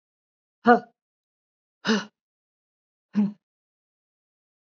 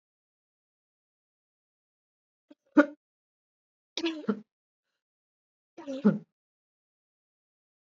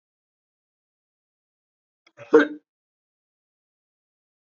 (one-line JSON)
{"exhalation_length": "4.6 s", "exhalation_amplitude": 25928, "exhalation_signal_mean_std_ratio": 0.22, "three_cough_length": "7.9 s", "three_cough_amplitude": 17273, "three_cough_signal_mean_std_ratio": 0.18, "cough_length": "4.5 s", "cough_amplitude": 26459, "cough_signal_mean_std_ratio": 0.14, "survey_phase": "beta (2021-08-13 to 2022-03-07)", "age": "45-64", "gender": "Female", "wearing_mask": "No", "symptom_cough_any": true, "symptom_sore_throat": true, "symptom_fatigue": true, "symptom_headache": true, "smoker_status": "Ex-smoker", "respiratory_condition_asthma": false, "respiratory_condition_other": false, "recruitment_source": "Test and Trace", "submission_delay": "2 days", "covid_test_result": "Positive", "covid_test_method": "RT-qPCR", "covid_ct_value": 20.0, "covid_ct_gene": "N gene"}